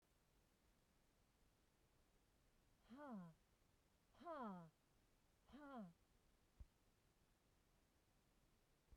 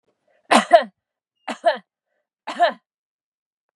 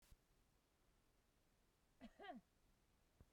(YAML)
exhalation_length: 9.0 s
exhalation_amplitude: 188
exhalation_signal_mean_std_ratio: 0.44
three_cough_length: 3.8 s
three_cough_amplitude: 32394
three_cough_signal_mean_std_ratio: 0.27
cough_length: 3.3 s
cough_amplitude: 178
cough_signal_mean_std_ratio: 0.45
survey_phase: beta (2021-08-13 to 2022-03-07)
age: 45-64
gender: Female
wearing_mask: 'No'
symptom_none: true
smoker_status: Never smoked
respiratory_condition_asthma: true
respiratory_condition_other: false
recruitment_source: REACT
submission_delay: 1 day
covid_test_result: Negative
covid_test_method: RT-qPCR